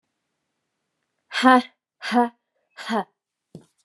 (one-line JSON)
{"exhalation_length": "3.8 s", "exhalation_amplitude": 29896, "exhalation_signal_mean_std_ratio": 0.28, "survey_phase": "beta (2021-08-13 to 2022-03-07)", "age": "45-64", "gender": "Female", "wearing_mask": "No", "symptom_runny_or_blocked_nose": true, "symptom_shortness_of_breath": true, "symptom_fatigue": true, "symptom_headache": true, "symptom_change_to_sense_of_smell_or_taste": true, "symptom_loss_of_taste": true, "symptom_onset": "3 days", "smoker_status": "Never smoked", "respiratory_condition_asthma": false, "respiratory_condition_other": false, "recruitment_source": "Test and Trace", "submission_delay": "2 days", "covid_test_result": "Positive", "covid_test_method": "RT-qPCR"}